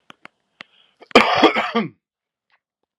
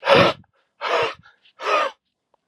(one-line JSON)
{"cough_length": "3.0 s", "cough_amplitude": 32768, "cough_signal_mean_std_ratio": 0.33, "exhalation_length": "2.5 s", "exhalation_amplitude": 30243, "exhalation_signal_mean_std_ratio": 0.46, "survey_phase": "alpha (2021-03-01 to 2021-08-12)", "age": "45-64", "gender": "Male", "wearing_mask": "No", "symptom_cough_any": true, "symptom_fatigue": true, "symptom_onset": "5 days", "smoker_status": "Never smoked", "respiratory_condition_asthma": false, "respiratory_condition_other": false, "recruitment_source": "Test and Trace", "submission_delay": "2 days", "covid_test_result": "Positive", "covid_test_method": "RT-qPCR", "covid_ct_value": 12.9, "covid_ct_gene": "N gene", "covid_ct_mean": 13.6, "covid_viral_load": "36000000 copies/ml", "covid_viral_load_category": "High viral load (>1M copies/ml)"}